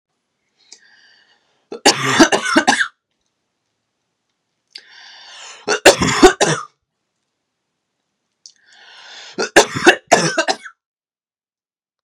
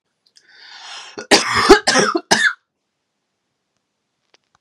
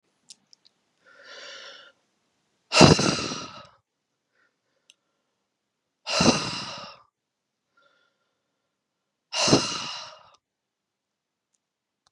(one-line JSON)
{"three_cough_length": "12.0 s", "three_cough_amplitude": 32768, "three_cough_signal_mean_std_ratio": 0.32, "cough_length": "4.6 s", "cough_amplitude": 32768, "cough_signal_mean_std_ratio": 0.35, "exhalation_length": "12.1 s", "exhalation_amplitude": 32768, "exhalation_signal_mean_std_ratio": 0.25, "survey_phase": "beta (2021-08-13 to 2022-03-07)", "age": "18-44", "gender": "Female", "wearing_mask": "No", "symptom_runny_or_blocked_nose": true, "symptom_fatigue": true, "symptom_onset": "5 days", "smoker_status": "Never smoked", "respiratory_condition_asthma": false, "respiratory_condition_other": false, "recruitment_source": "REACT", "submission_delay": "1 day", "covid_test_result": "Negative", "covid_test_method": "RT-qPCR", "influenza_a_test_result": "Negative", "influenza_b_test_result": "Negative"}